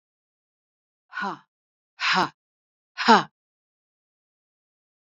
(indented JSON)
{
  "exhalation_length": "5.0 s",
  "exhalation_amplitude": 25474,
  "exhalation_signal_mean_std_ratio": 0.23,
  "survey_phase": "beta (2021-08-13 to 2022-03-07)",
  "age": "65+",
  "gender": "Female",
  "wearing_mask": "No",
  "symptom_none": true,
  "symptom_onset": "11 days",
  "smoker_status": "Ex-smoker",
  "respiratory_condition_asthma": false,
  "respiratory_condition_other": false,
  "recruitment_source": "REACT",
  "submission_delay": "2 days",
  "covid_test_result": "Negative",
  "covid_test_method": "RT-qPCR",
  "covid_ct_value": 38.0,
  "covid_ct_gene": "N gene",
  "influenza_a_test_result": "Negative",
  "influenza_b_test_result": "Negative"
}